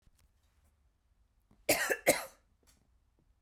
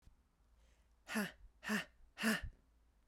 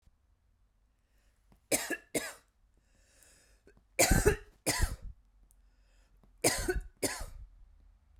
cough_length: 3.4 s
cough_amplitude: 8223
cough_signal_mean_std_ratio: 0.26
exhalation_length: 3.1 s
exhalation_amplitude: 2320
exhalation_signal_mean_std_ratio: 0.4
three_cough_length: 8.2 s
three_cough_amplitude: 10597
three_cough_signal_mean_std_ratio: 0.34
survey_phase: beta (2021-08-13 to 2022-03-07)
age: 18-44
gender: Female
wearing_mask: 'No'
symptom_none: true
smoker_status: Ex-smoker
respiratory_condition_asthma: false
respiratory_condition_other: false
recruitment_source: REACT
submission_delay: 1 day
covid_test_result: Negative
covid_test_method: RT-qPCR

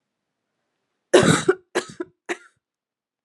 three_cough_length: 3.2 s
three_cough_amplitude: 31887
three_cough_signal_mean_std_ratio: 0.28
survey_phase: beta (2021-08-13 to 2022-03-07)
age: 18-44
gender: Female
wearing_mask: 'No'
symptom_runny_or_blocked_nose: true
symptom_change_to_sense_of_smell_or_taste: true
symptom_loss_of_taste: true
smoker_status: Never smoked
respiratory_condition_asthma: false
respiratory_condition_other: false
recruitment_source: Test and Trace
submission_delay: 4 days
covid_test_result: Positive
covid_test_method: LFT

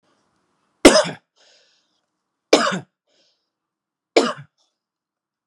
three_cough_length: 5.5 s
three_cough_amplitude: 32768
three_cough_signal_mean_std_ratio: 0.23
survey_phase: beta (2021-08-13 to 2022-03-07)
age: 18-44
gender: Male
wearing_mask: 'No'
symptom_none: true
smoker_status: Ex-smoker
respiratory_condition_asthma: false
respiratory_condition_other: false
recruitment_source: REACT
submission_delay: 2 days
covid_test_result: Negative
covid_test_method: RT-qPCR
influenza_a_test_result: Negative
influenza_b_test_result: Negative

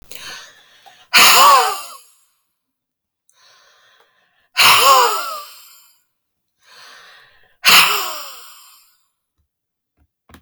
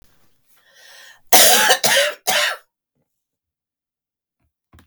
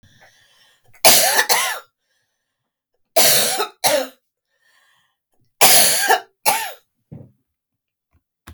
exhalation_length: 10.4 s
exhalation_amplitude: 32768
exhalation_signal_mean_std_ratio: 0.36
cough_length: 4.9 s
cough_amplitude: 32768
cough_signal_mean_std_ratio: 0.36
three_cough_length: 8.5 s
three_cough_amplitude: 32768
three_cough_signal_mean_std_ratio: 0.4
survey_phase: beta (2021-08-13 to 2022-03-07)
age: 65+
gender: Female
wearing_mask: 'No'
symptom_none: true
smoker_status: Ex-smoker
respiratory_condition_asthma: false
respiratory_condition_other: false
recruitment_source: REACT
submission_delay: 4 days
covid_test_result: Negative
covid_test_method: RT-qPCR
influenza_a_test_result: Negative
influenza_b_test_result: Negative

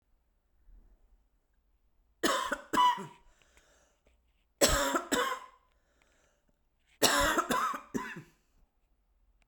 three_cough_length: 9.5 s
three_cough_amplitude: 11615
three_cough_signal_mean_std_ratio: 0.39
survey_phase: beta (2021-08-13 to 2022-03-07)
age: 45-64
gender: Female
wearing_mask: 'No'
symptom_cough_any: true
symptom_new_continuous_cough: true
symptom_runny_or_blocked_nose: true
symptom_shortness_of_breath: true
symptom_sore_throat: true
symptom_headache: true
symptom_onset: 2 days
smoker_status: Never smoked
respiratory_condition_asthma: false
respiratory_condition_other: false
recruitment_source: Test and Trace
submission_delay: 1 day
covid_test_result: Positive
covid_test_method: RT-qPCR
covid_ct_value: 25.5
covid_ct_gene: ORF1ab gene
covid_ct_mean: 26.5
covid_viral_load: 2100 copies/ml
covid_viral_load_category: Minimal viral load (< 10K copies/ml)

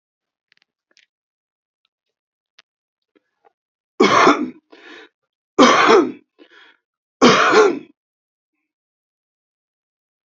three_cough_length: 10.2 s
three_cough_amplitude: 29739
three_cough_signal_mean_std_ratio: 0.31
survey_phase: beta (2021-08-13 to 2022-03-07)
age: 65+
gender: Male
wearing_mask: 'No'
symptom_cough_any: true
smoker_status: Current smoker (1 to 10 cigarettes per day)
respiratory_condition_asthma: false
respiratory_condition_other: false
recruitment_source: REACT
submission_delay: 0 days
covid_test_result: Negative
covid_test_method: RT-qPCR
influenza_a_test_result: Negative
influenza_b_test_result: Negative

